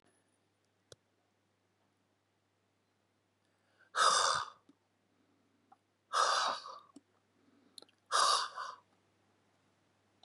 {"exhalation_length": "10.2 s", "exhalation_amplitude": 5358, "exhalation_signal_mean_std_ratio": 0.31, "survey_phase": "beta (2021-08-13 to 2022-03-07)", "age": "65+", "gender": "Male", "wearing_mask": "No", "symptom_cough_any": true, "symptom_runny_or_blocked_nose": true, "symptom_sore_throat": true, "symptom_onset": "4 days", "smoker_status": "Never smoked", "respiratory_condition_asthma": false, "respiratory_condition_other": false, "recruitment_source": "Test and Trace", "submission_delay": "1 day", "covid_test_result": "Positive", "covid_test_method": "RT-qPCR", "covid_ct_value": 23.0, "covid_ct_gene": "N gene"}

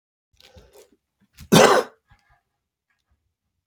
{"cough_length": "3.7 s", "cough_amplitude": 28207, "cough_signal_mean_std_ratio": 0.23, "survey_phase": "beta (2021-08-13 to 2022-03-07)", "age": "45-64", "gender": "Male", "wearing_mask": "No", "symptom_cough_any": true, "smoker_status": "Never smoked", "respiratory_condition_asthma": true, "respiratory_condition_other": false, "recruitment_source": "REACT", "submission_delay": "-1 day", "covid_test_result": "Negative", "covid_test_method": "RT-qPCR", "influenza_a_test_result": "Negative", "influenza_b_test_result": "Negative"}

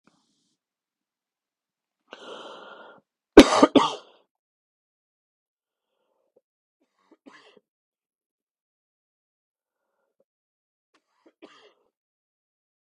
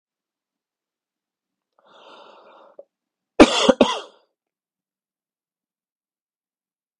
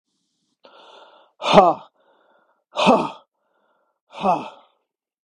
{"three_cough_length": "12.9 s", "three_cough_amplitude": 32768, "three_cough_signal_mean_std_ratio": 0.12, "cough_length": "7.0 s", "cough_amplitude": 32768, "cough_signal_mean_std_ratio": 0.17, "exhalation_length": "5.4 s", "exhalation_amplitude": 32768, "exhalation_signal_mean_std_ratio": 0.29, "survey_phase": "beta (2021-08-13 to 2022-03-07)", "age": "45-64", "gender": "Male", "wearing_mask": "No", "symptom_new_continuous_cough": true, "symptom_runny_or_blocked_nose": true, "symptom_sore_throat": true, "symptom_fatigue": true, "symptom_headache": true, "symptom_onset": "4 days", "smoker_status": "Never smoked", "respiratory_condition_asthma": false, "respiratory_condition_other": false, "recruitment_source": "REACT", "submission_delay": "1 day", "covid_test_result": "Negative", "covid_test_method": "RT-qPCR", "influenza_a_test_result": "Negative", "influenza_b_test_result": "Negative"}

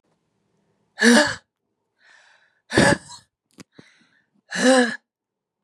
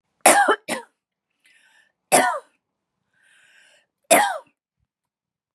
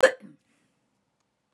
{"exhalation_length": "5.6 s", "exhalation_amplitude": 27159, "exhalation_signal_mean_std_ratio": 0.32, "three_cough_length": "5.5 s", "three_cough_amplitude": 32768, "three_cough_signal_mean_std_ratio": 0.3, "cough_length": "1.5 s", "cough_amplitude": 17410, "cough_signal_mean_std_ratio": 0.18, "survey_phase": "beta (2021-08-13 to 2022-03-07)", "age": "45-64", "gender": "Female", "wearing_mask": "No", "symptom_none": true, "smoker_status": "Ex-smoker", "respiratory_condition_asthma": false, "respiratory_condition_other": false, "recruitment_source": "Test and Trace", "submission_delay": "2 days", "covid_test_result": "Negative", "covid_test_method": "RT-qPCR"}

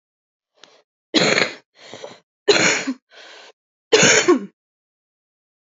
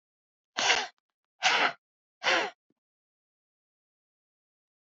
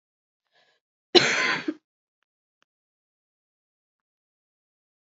{"three_cough_length": "5.6 s", "three_cough_amplitude": 31097, "three_cough_signal_mean_std_ratio": 0.37, "exhalation_length": "4.9 s", "exhalation_amplitude": 15261, "exhalation_signal_mean_std_ratio": 0.31, "cough_length": "5.0 s", "cough_amplitude": 30712, "cough_signal_mean_std_ratio": 0.21, "survey_phase": "beta (2021-08-13 to 2022-03-07)", "age": "18-44", "gender": "Female", "wearing_mask": "No", "symptom_cough_any": true, "symptom_runny_or_blocked_nose": true, "symptom_sore_throat": true, "symptom_abdominal_pain": true, "symptom_fatigue": true, "symptom_headache": true, "symptom_change_to_sense_of_smell_or_taste": true, "symptom_onset": "5 days", "smoker_status": "Current smoker (e-cigarettes or vapes only)", "respiratory_condition_asthma": false, "respiratory_condition_other": false, "recruitment_source": "Test and Trace", "submission_delay": "1 day", "covid_test_result": "Positive", "covid_test_method": "RT-qPCR", "covid_ct_value": 14.0, "covid_ct_gene": "ORF1ab gene", "covid_ct_mean": 14.3, "covid_viral_load": "21000000 copies/ml", "covid_viral_load_category": "High viral load (>1M copies/ml)"}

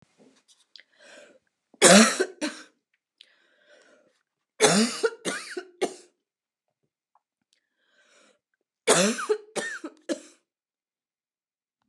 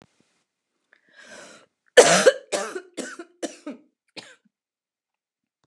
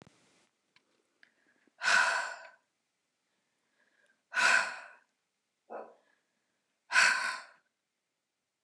{"three_cough_length": "11.9 s", "three_cough_amplitude": 28897, "three_cough_signal_mean_std_ratio": 0.28, "cough_length": "5.7 s", "cough_amplitude": 29204, "cough_signal_mean_std_ratio": 0.23, "exhalation_length": "8.6 s", "exhalation_amplitude": 8884, "exhalation_signal_mean_std_ratio": 0.31, "survey_phase": "beta (2021-08-13 to 2022-03-07)", "age": "45-64", "gender": "Female", "wearing_mask": "No", "symptom_sore_throat": true, "symptom_fatigue": true, "symptom_headache": true, "symptom_onset": "3 days", "smoker_status": "Never smoked", "respiratory_condition_asthma": false, "respiratory_condition_other": false, "recruitment_source": "Test and Trace", "submission_delay": "1 day", "covid_test_result": "Positive", "covid_test_method": "RT-qPCR", "covid_ct_value": 31.9, "covid_ct_gene": "ORF1ab gene", "covid_ct_mean": 32.1, "covid_viral_load": "31 copies/ml", "covid_viral_load_category": "Minimal viral load (< 10K copies/ml)"}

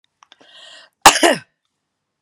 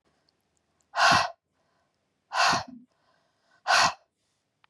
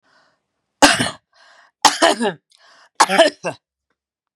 {"cough_length": "2.2 s", "cough_amplitude": 32768, "cough_signal_mean_std_ratio": 0.25, "exhalation_length": "4.7 s", "exhalation_amplitude": 13274, "exhalation_signal_mean_std_ratio": 0.35, "three_cough_length": "4.4 s", "three_cough_amplitude": 32768, "three_cough_signal_mean_std_ratio": 0.34, "survey_phase": "beta (2021-08-13 to 2022-03-07)", "age": "45-64", "gender": "Female", "wearing_mask": "No", "symptom_runny_or_blocked_nose": true, "smoker_status": "Never smoked", "respiratory_condition_asthma": false, "respiratory_condition_other": false, "recruitment_source": "REACT", "submission_delay": "2 days", "covid_test_result": "Negative", "covid_test_method": "RT-qPCR", "influenza_a_test_result": "Negative", "influenza_b_test_result": "Negative"}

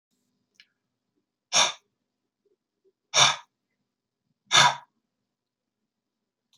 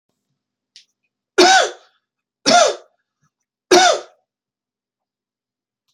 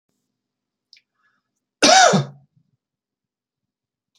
{"exhalation_length": "6.6 s", "exhalation_amplitude": 20814, "exhalation_signal_mean_std_ratio": 0.23, "three_cough_length": "5.9 s", "three_cough_amplitude": 32767, "three_cough_signal_mean_std_ratio": 0.31, "cough_length": "4.2 s", "cough_amplitude": 30878, "cough_signal_mean_std_ratio": 0.26, "survey_phase": "beta (2021-08-13 to 2022-03-07)", "age": "45-64", "gender": "Male", "wearing_mask": "No", "symptom_none": true, "smoker_status": "Never smoked", "respiratory_condition_asthma": false, "respiratory_condition_other": false, "recruitment_source": "Test and Trace", "submission_delay": "0 days", "covid_test_result": "Negative", "covid_test_method": "LFT"}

